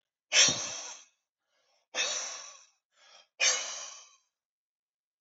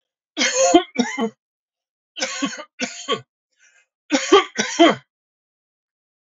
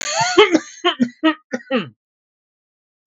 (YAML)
exhalation_length: 5.2 s
exhalation_amplitude: 11732
exhalation_signal_mean_std_ratio: 0.35
three_cough_length: 6.3 s
three_cough_amplitude: 32768
three_cough_signal_mean_std_ratio: 0.38
cough_length: 3.1 s
cough_amplitude: 32768
cough_signal_mean_std_ratio: 0.44
survey_phase: beta (2021-08-13 to 2022-03-07)
age: 45-64
gender: Male
wearing_mask: 'No'
symptom_runny_or_blocked_nose: true
symptom_onset: 4 days
smoker_status: Prefer not to say
respiratory_condition_asthma: false
respiratory_condition_other: false
recruitment_source: REACT
submission_delay: 3 days
covid_test_result: Negative
covid_test_method: RT-qPCR
influenza_a_test_result: Negative
influenza_b_test_result: Negative